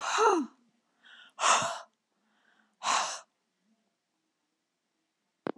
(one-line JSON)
{"exhalation_length": "5.6 s", "exhalation_amplitude": 10759, "exhalation_signal_mean_std_ratio": 0.36, "survey_phase": "beta (2021-08-13 to 2022-03-07)", "age": "65+", "gender": "Female", "wearing_mask": "No", "symptom_none": true, "symptom_onset": "12 days", "smoker_status": "Never smoked", "respiratory_condition_asthma": false, "respiratory_condition_other": false, "recruitment_source": "REACT", "submission_delay": "2 days", "covid_test_result": "Negative", "covid_test_method": "RT-qPCR", "influenza_a_test_result": "Negative", "influenza_b_test_result": "Negative"}